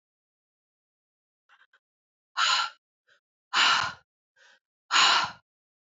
{
  "exhalation_length": "5.9 s",
  "exhalation_amplitude": 15628,
  "exhalation_signal_mean_std_ratio": 0.34,
  "survey_phase": "beta (2021-08-13 to 2022-03-07)",
  "age": "45-64",
  "gender": "Female",
  "wearing_mask": "No",
  "symptom_none": true,
  "smoker_status": "Ex-smoker",
  "respiratory_condition_asthma": false,
  "respiratory_condition_other": false,
  "recruitment_source": "REACT",
  "submission_delay": "3 days",
  "covid_test_result": "Negative",
  "covid_test_method": "RT-qPCR",
  "influenza_a_test_result": "Negative",
  "influenza_b_test_result": "Negative"
}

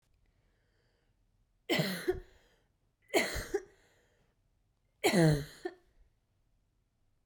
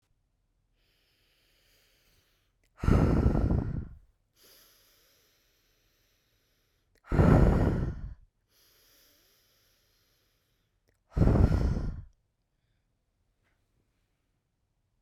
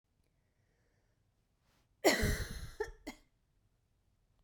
{
  "three_cough_length": "7.3 s",
  "three_cough_amplitude": 7626,
  "three_cough_signal_mean_std_ratio": 0.31,
  "exhalation_length": "15.0 s",
  "exhalation_amplitude": 13169,
  "exhalation_signal_mean_std_ratio": 0.33,
  "cough_length": "4.4 s",
  "cough_amplitude": 7284,
  "cough_signal_mean_std_ratio": 0.28,
  "survey_phase": "beta (2021-08-13 to 2022-03-07)",
  "age": "18-44",
  "gender": "Female",
  "wearing_mask": "No",
  "symptom_none": true,
  "smoker_status": "Never smoked",
  "respiratory_condition_asthma": false,
  "respiratory_condition_other": false,
  "recruitment_source": "REACT",
  "submission_delay": "1 day",
  "covid_test_result": "Negative",
  "covid_test_method": "RT-qPCR"
}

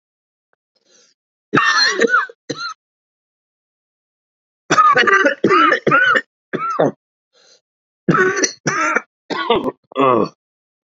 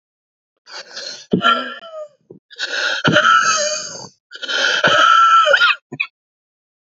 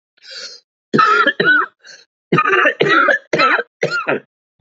{
  "three_cough_length": "10.8 s",
  "three_cough_amplitude": 29275,
  "three_cough_signal_mean_std_ratio": 0.5,
  "exhalation_length": "6.9 s",
  "exhalation_amplitude": 29659,
  "exhalation_signal_mean_std_ratio": 0.57,
  "cough_length": "4.6 s",
  "cough_amplitude": 31774,
  "cough_signal_mean_std_ratio": 0.61,
  "survey_phase": "beta (2021-08-13 to 2022-03-07)",
  "age": "45-64",
  "gender": "Male",
  "wearing_mask": "No",
  "symptom_cough_any": true,
  "symptom_shortness_of_breath": true,
  "symptom_sore_throat": true,
  "symptom_abdominal_pain": true,
  "symptom_diarrhoea": true,
  "symptom_fatigue": true,
  "symptom_headache": true,
  "symptom_change_to_sense_of_smell_or_taste": true,
  "symptom_onset": "2 days",
  "smoker_status": "Never smoked",
  "respiratory_condition_asthma": true,
  "respiratory_condition_other": false,
  "recruitment_source": "Test and Trace",
  "submission_delay": "2 days",
  "covid_test_result": "Positive",
  "covid_test_method": "RT-qPCR"
}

